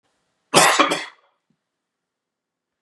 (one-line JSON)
{"cough_length": "2.8 s", "cough_amplitude": 32659, "cough_signal_mean_std_ratio": 0.3, "survey_phase": "beta (2021-08-13 to 2022-03-07)", "age": "65+", "gender": "Male", "wearing_mask": "No", "symptom_cough_any": true, "symptom_runny_or_blocked_nose": true, "smoker_status": "Never smoked", "respiratory_condition_asthma": false, "respiratory_condition_other": false, "recruitment_source": "REACT", "submission_delay": "3 days", "covid_test_result": "Negative", "covid_test_method": "RT-qPCR", "influenza_a_test_result": "Negative", "influenza_b_test_result": "Negative"}